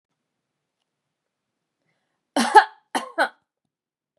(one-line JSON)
{"cough_length": "4.2 s", "cough_amplitude": 32643, "cough_signal_mean_std_ratio": 0.2, "survey_phase": "beta (2021-08-13 to 2022-03-07)", "age": "45-64", "gender": "Female", "wearing_mask": "No", "symptom_headache": true, "smoker_status": "Never smoked", "respiratory_condition_asthma": false, "respiratory_condition_other": false, "recruitment_source": "Test and Trace", "submission_delay": "1 day", "covid_test_result": "Positive", "covid_test_method": "RT-qPCR"}